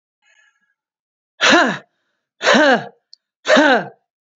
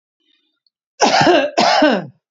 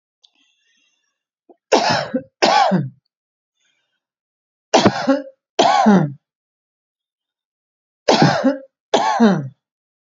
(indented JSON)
{
  "exhalation_length": "4.4 s",
  "exhalation_amplitude": 30566,
  "exhalation_signal_mean_std_ratio": 0.4,
  "cough_length": "2.3 s",
  "cough_amplitude": 29882,
  "cough_signal_mean_std_ratio": 0.56,
  "three_cough_length": "10.2 s",
  "three_cough_amplitude": 32767,
  "three_cough_signal_mean_std_ratio": 0.42,
  "survey_phase": "beta (2021-08-13 to 2022-03-07)",
  "age": "45-64",
  "gender": "Female",
  "wearing_mask": "No",
  "symptom_runny_or_blocked_nose": true,
  "symptom_shortness_of_breath": true,
  "smoker_status": "Never smoked",
  "respiratory_condition_asthma": true,
  "respiratory_condition_other": false,
  "recruitment_source": "REACT",
  "submission_delay": "2 days",
  "covid_test_result": "Negative",
  "covid_test_method": "RT-qPCR",
  "influenza_a_test_result": "Negative",
  "influenza_b_test_result": "Negative"
}